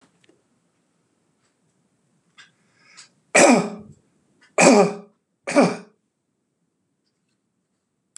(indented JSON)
{
  "three_cough_length": "8.2 s",
  "three_cough_amplitude": 32167,
  "three_cough_signal_mean_std_ratio": 0.26,
  "survey_phase": "beta (2021-08-13 to 2022-03-07)",
  "age": "65+",
  "gender": "Male",
  "wearing_mask": "No",
  "symptom_runny_or_blocked_nose": true,
  "symptom_fatigue": true,
  "symptom_other": true,
  "smoker_status": "Never smoked",
  "respiratory_condition_asthma": false,
  "respiratory_condition_other": false,
  "recruitment_source": "REACT",
  "submission_delay": "2 days",
  "covid_test_result": "Negative",
  "covid_test_method": "RT-qPCR",
  "influenza_a_test_result": "Negative",
  "influenza_b_test_result": "Negative"
}